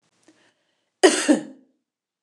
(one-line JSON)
{"cough_length": "2.2 s", "cough_amplitude": 29091, "cough_signal_mean_std_ratio": 0.28, "survey_phase": "beta (2021-08-13 to 2022-03-07)", "age": "45-64", "gender": "Female", "wearing_mask": "No", "symptom_fatigue": true, "symptom_headache": true, "smoker_status": "Never smoked", "respiratory_condition_asthma": false, "respiratory_condition_other": false, "recruitment_source": "REACT", "submission_delay": "2 days", "covid_test_result": "Negative", "covid_test_method": "RT-qPCR", "influenza_a_test_result": "Unknown/Void", "influenza_b_test_result": "Unknown/Void"}